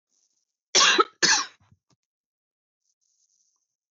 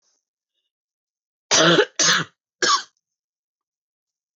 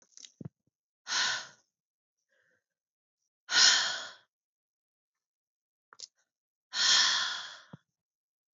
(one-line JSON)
{"cough_length": "3.9 s", "cough_amplitude": 18059, "cough_signal_mean_std_ratio": 0.28, "three_cough_length": "4.4 s", "three_cough_amplitude": 19164, "three_cough_signal_mean_std_ratio": 0.34, "exhalation_length": "8.5 s", "exhalation_amplitude": 15355, "exhalation_signal_mean_std_ratio": 0.32, "survey_phase": "beta (2021-08-13 to 2022-03-07)", "age": "18-44", "gender": "Female", "wearing_mask": "No", "symptom_cough_any": true, "symptom_runny_or_blocked_nose": true, "symptom_shortness_of_breath": true, "symptom_sore_throat": true, "smoker_status": "Never smoked", "respiratory_condition_asthma": false, "respiratory_condition_other": false, "recruitment_source": "Test and Trace", "submission_delay": "2 days", "covid_test_result": "Positive", "covid_test_method": "LFT"}